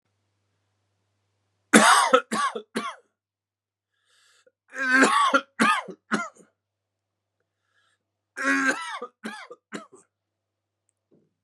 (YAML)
three_cough_length: 11.4 s
three_cough_amplitude: 30553
three_cough_signal_mean_std_ratio: 0.34
survey_phase: beta (2021-08-13 to 2022-03-07)
age: 18-44
gender: Male
wearing_mask: 'No'
symptom_cough_any: true
symptom_runny_or_blocked_nose: true
symptom_fatigue: true
symptom_headache: true
symptom_onset: 3 days
smoker_status: Never smoked
respiratory_condition_asthma: false
respiratory_condition_other: false
recruitment_source: Test and Trace
submission_delay: 2 days
covid_test_result: Positive
covid_test_method: RT-qPCR
covid_ct_value: 32.2
covid_ct_gene: ORF1ab gene